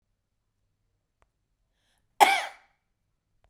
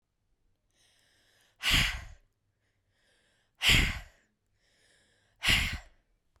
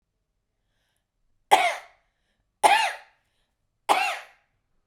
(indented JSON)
{
  "cough_length": "3.5 s",
  "cough_amplitude": 29072,
  "cough_signal_mean_std_ratio": 0.18,
  "exhalation_length": "6.4 s",
  "exhalation_amplitude": 10281,
  "exhalation_signal_mean_std_ratio": 0.32,
  "three_cough_length": "4.9 s",
  "three_cough_amplitude": 32767,
  "three_cough_signal_mean_std_ratio": 0.3,
  "survey_phase": "beta (2021-08-13 to 2022-03-07)",
  "age": "45-64",
  "gender": "Female",
  "wearing_mask": "No",
  "symptom_change_to_sense_of_smell_or_taste": true,
  "symptom_onset": "12 days",
  "smoker_status": "Current smoker (e-cigarettes or vapes only)",
  "respiratory_condition_asthma": false,
  "respiratory_condition_other": false,
  "recruitment_source": "REACT",
  "submission_delay": "2 days",
  "covid_test_result": "Negative",
  "covid_test_method": "RT-qPCR",
  "covid_ct_value": 39.0,
  "covid_ct_gene": "N gene",
  "influenza_a_test_result": "Negative",
  "influenza_b_test_result": "Negative"
}